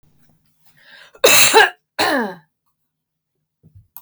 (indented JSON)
{
  "cough_length": "4.0 s",
  "cough_amplitude": 32768,
  "cough_signal_mean_std_ratio": 0.34,
  "survey_phase": "beta (2021-08-13 to 2022-03-07)",
  "age": "45-64",
  "gender": "Female",
  "wearing_mask": "No",
  "symptom_cough_any": true,
  "symptom_onset": "11 days",
  "smoker_status": "Ex-smoker",
  "respiratory_condition_asthma": true,
  "respiratory_condition_other": false,
  "recruitment_source": "REACT",
  "submission_delay": "7 days",
  "covid_test_result": "Negative",
  "covid_test_method": "RT-qPCR"
}